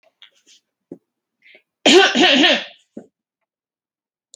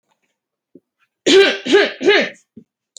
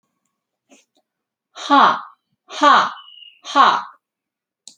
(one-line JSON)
{"three_cough_length": "4.4 s", "three_cough_amplitude": 30960, "three_cough_signal_mean_std_ratio": 0.34, "cough_length": "3.0 s", "cough_amplitude": 29437, "cough_signal_mean_std_ratio": 0.43, "exhalation_length": "4.8 s", "exhalation_amplitude": 30521, "exhalation_signal_mean_std_ratio": 0.36, "survey_phase": "alpha (2021-03-01 to 2021-08-12)", "age": "18-44", "gender": "Female", "wearing_mask": "No", "symptom_none": true, "smoker_status": "Never smoked", "respiratory_condition_asthma": false, "respiratory_condition_other": false, "recruitment_source": "REACT", "submission_delay": "2 days", "covid_test_result": "Negative", "covid_test_method": "RT-qPCR"}